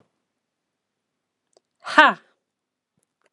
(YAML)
exhalation_length: 3.3 s
exhalation_amplitude: 32759
exhalation_signal_mean_std_ratio: 0.17
survey_phase: beta (2021-08-13 to 2022-03-07)
age: 45-64
gender: Female
wearing_mask: 'No'
symptom_none: true
smoker_status: Ex-smoker
respiratory_condition_asthma: false
respiratory_condition_other: false
recruitment_source: REACT
submission_delay: 1 day
covid_test_result: Negative
covid_test_method: RT-qPCR